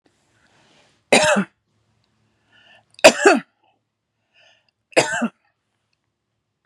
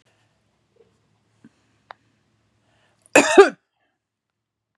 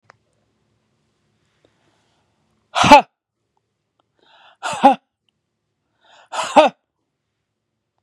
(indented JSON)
{
  "three_cough_length": "6.7 s",
  "three_cough_amplitude": 32768,
  "three_cough_signal_mean_std_ratio": 0.26,
  "cough_length": "4.8 s",
  "cough_amplitude": 32768,
  "cough_signal_mean_std_ratio": 0.18,
  "exhalation_length": "8.0 s",
  "exhalation_amplitude": 32768,
  "exhalation_signal_mean_std_ratio": 0.21,
  "survey_phase": "beta (2021-08-13 to 2022-03-07)",
  "age": "45-64",
  "gender": "Female",
  "wearing_mask": "No",
  "symptom_fatigue": true,
  "smoker_status": "Ex-smoker",
  "respiratory_condition_asthma": false,
  "respiratory_condition_other": false,
  "recruitment_source": "REACT",
  "submission_delay": "0 days",
  "covid_test_result": "Negative",
  "covid_test_method": "RT-qPCR",
  "influenza_a_test_result": "Unknown/Void",
  "influenza_b_test_result": "Unknown/Void"
}